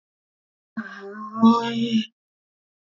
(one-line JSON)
{"exhalation_length": "2.8 s", "exhalation_amplitude": 17508, "exhalation_signal_mean_std_ratio": 0.41, "survey_phase": "alpha (2021-03-01 to 2021-08-12)", "age": "45-64", "gender": "Female", "wearing_mask": "No", "symptom_none": true, "smoker_status": "Never smoked", "respiratory_condition_asthma": false, "respiratory_condition_other": false, "recruitment_source": "REACT", "submission_delay": "3 days", "covid_test_result": "Negative", "covid_test_method": "RT-qPCR"}